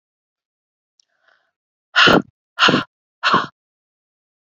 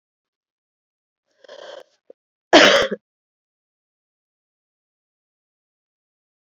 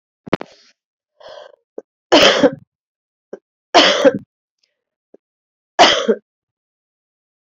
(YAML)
exhalation_length: 4.4 s
exhalation_amplitude: 31093
exhalation_signal_mean_std_ratio: 0.31
cough_length: 6.5 s
cough_amplitude: 29699
cough_signal_mean_std_ratio: 0.19
three_cough_length: 7.4 s
three_cough_amplitude: 32767
three_cough_signal_mean_std_ratio: 0.31
survey_phase: beta (2021-08-13 to 2022-03-07)
age: 45-64
gender: Female
wearing_mask: 'No'
symptom_cough_any: true
symptom_runny_or_blocked_nose: true
symptom_fatigue: true
symptom_onset: 3 days
smoker_status: Never smoked
respiratory_condition_asthma: true
respiratory_condition_other: false
recruitment_source: Test and Trace
submission_delay: 2 days
covid_test_result: Positive
covid_test_method: RT-qPCR
covid_ct_value: 18.6
covid_ct_gene: ORF1ab gene
covid_ct_mean: 19.1
covid_viral_load: 560000 copies/ml
covid_viral_load_category: Low viral load (10K-1M copies/ml)